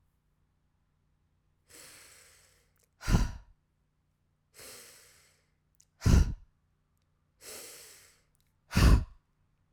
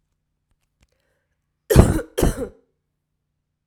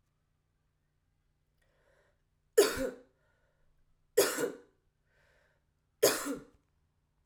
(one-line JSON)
{"exhalation_length": "9.7 s", "exhalation_amplitude": 11202, "exhalation_signal_mean_std_ratio": 0.24, "cough_length": "3.7 s", "cough_amplitude": 32768, "cough_signal_mean_std_ratio": 0.26, "three_cough_length": "7.3 s", "three_cough_amplitude": 8728, "three_cough_signal_mean_std_ratio": 0.25, "survey_phase": "alpha (2021-03-01 to 2021-08-12)", "age": "18-44", "gender": "Female", "wearing_mask": "No", "symptom_cough_any": true, "symptom_onset": "4 days", "smoker_status": "Never smoked", "respiratory_condition_asthma": false, "respiratory_condition_other": false, "recruitment_source": "REACT", "submission_delay": "3 days", "covid_test_result": "Negative", "covid_test_method": "RT-qPCR"}